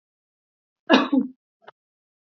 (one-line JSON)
{"cough_length": "2.3 s", "cough_amplitude": 26924, "cough_signal_mean_std_ratio": 0.28, "survey_phase": "beta (2021-08-13 to 2022-03-07)", "age": "18-44", "gender": "Female", "wearing_mask": "No", "symptom_fatigue": true, "symptom_headache": true, "symptom_onset": "5 days", "smoker_status": "Ex-smoker", "respiratory_condition_asthma": false, "respiratory_condition_other": false, "recruitment_source": "REACT", "submission_delay": "1 day", "covid_test_result": "Negative", "covid_test_method": "RT-qPCR", "influenza_a_test_result": "Negative", "influenza_b_test_result": "Negative"}